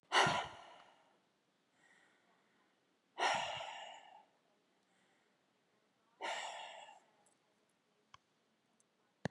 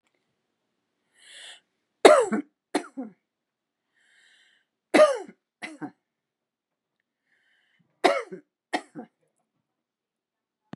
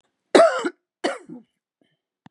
{"exhalation_length": "9.3 s", "exhalation_amplitude": 4038, "exhalation_signal_mean_std_ratio": 0.3, "three_cough_length": "10.8 s", "three_cough_amplitude": 32300, "three_cough_signal_mean_std_ratio": 0.21, "cough_length": "2.3 s", "cough_amplitude": 30602, "cough_signal_mean_std_ratio": 0.3, "survey_phase": "beta (2021-08-13 to 2022-03-07)", "age": "65+", "gender": "Female", "wearing_mask": "No", "symptom_none": true, "smoker_status": "Ex-smoker", "respiratory_condition_asthma": false, "respiratory_condition_other": false, "recruitment_source": "REACT", "submission_delay": "6 days", "covid_test_result": "Negative", "covid_test_method": "RT-qPCR", "influenza_a_test_result": "Negative", "influenza_b_test_result": "Negative"}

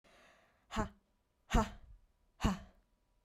{"exhalation_length": "3.2 s", "exhalation_amplitude": 4247, "exhalation_signal_mean_std_ratio": 0.3, "survey_phase": "beta (2021-08-13 to 2022-03-07)", "age": "18-44", "gender": "Female", "wearing_mask": "No", "symptom_none": true, "smoker_status": "Never smoked", "respiratory_condition_asthma": false, "respiratory_condition_other": false, "recruitment_source": "REACT", "submission_delay": "4 days", "covid_test_result": "Negative", "covid_test_method": "RT-qPCR"}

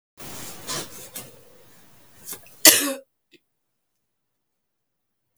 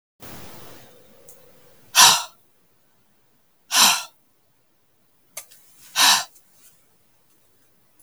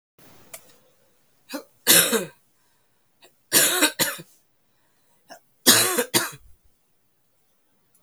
{"cough_length": "5.4 s", "cough_amplitude": 32768, "cough_signal_mean_std_ratio": 0.23, "exhalation_length": "8.0 s", "exhalation_amplitude": 32768, "exhalation_signal_mean_std_ratio": 0.27, "three_cough_length": "8.0 s", "three_cough_amplitude": 32127, "three_cough_signal_mean_std_ratio": 0.33, "survey_phase": "beta (2021-08-13 to 2022-03-07)", "age": "45-64", "gender": "Female", "wearing_mask": "No", "symptom_new_continuous_cough": true, "symptom_runny_or_blocked_nose": true, "symptom_sore_throat": true, "symptom_fatigue": true, "symptom_fever_high_temperature": true, "symptom_headache": true, "symptom_change_to_sense_of_smell_or_taste": true, "symptom_onset": "2 days", "smoker_status": "Never smoked", "respiratory_condition_asthma": false, "respiratory_condition_other": false, "recruitment_source": "Test and Trace", "submission_delay": "1 day", "covid_test_result": "Positive", "covid_test_method": "RT-qPCR", "covid_ct_value": 17.6, "covid_ct_gene": "N gene"}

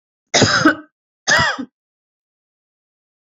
{"cough_length": "3.2 s", "cough_amplitude": 29160, "cough_signal_mean_std_ratio": 0.38, "survey_phase": "beta (2021-08-13 to 2022-03-07)", "age": "45-64", "gender": "Female", "wearing_mask": "No", "symptom_none": true, "smoker_status": "Never smoked", "respiratory_condition_asthma": false, "respiratory_condition_other": false, "recruitment_source": "REACT", "submission_delay": "3 days", "covid_test_result": "Negative", "covid_test_method": "RT-qPCR"}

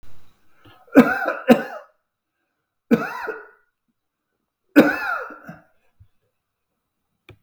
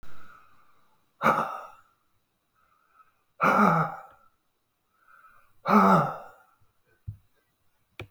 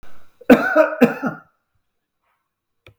{"three_cough_length": "7.4 s", "three_cough_amplitude": 32768, "three_cough_signal_mean_std_ratio": 0.29, "exhalation_length": "8.1 s", "exhalation_amplitude": 14558, "exhalation_signal_mean_std_ratio": 0.35, "cough_length": "3.0 s", "cough_amplitude": 32768, "cough_signal_mean_std_ratio": 0.35, "survey_phase": "beta (2021-08-13 to 2022-03-07)", "age": "65+", "gender": "Male", "wearing_mask": "No", "symptom_none": true, "smoker_status": "Ex-smoker", "respiratory_condition_asthma": false, "respiratory_condition_other": true, "recruitment_source": "REACT", "submission_delay": "2 days", "covid_test_result": "Negative", "covid_test_method": "RT-qPCR", "influenza_a_test_result": "Negative", "influenza_b_test_result": "Negative"}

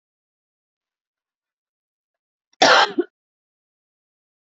{"cough_length": "4.5 s", "cough_amplitude": 27485, "cough_signal_mean_std_ratio": 0.21, "survey_phase": "beta (2021-08-13 to 2022-03-07)", "age": "45-64", "gender": "Female", "wearing_mask": "No", "symptom_cough_any": true, "symptom_fatigue": true, "smoker_status": "Never smoked", "respiratory_condition_asthma": false, "respiratory_condition_other": false, "recruitment_source": "REACT", "submission_delay": "3 days", "covid_test_result": "Negative", "covid_test_method": "RT-qPCR", "influenza_a_test_result": "Negative", "influenza_b_test_result": "Negative"}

